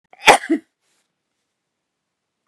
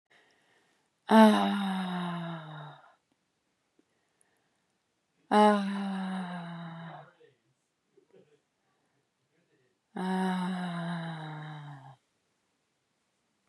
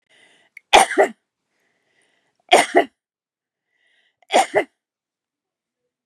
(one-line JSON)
{"cough_length": "2.5 s", "cough_amplitude": 32768, "cough_signal_mean_std_ratio": 0.21, "exhalation_length": "13.5 s", "exhalation_amplitude": 16995, "exhalation_signal_mean_std_ratio": 0.36, "three_cough_length": "6.1 s", "three_cough_amplitude": 32767, "three_cough_signal_mean_std_ratio": 0.26, "survey_phase": "beta (2021-08-13 to 2022-03-07)", "age": "45-64", "gender": "Female", "wearing_mask": "No", "symptom_none": true, "smoker_status": "Never smoked", "respiratory_condition_asthma": false, "respiratory_condition_other": true, "recruitment_source": "REACT", "submission_delay": "0 days", "covid_test_result": "Negative", "covid_test_method": "RT-qPCR", "influenza_a_test_result": "Negative", "influenza_b_test_result": "Negative"}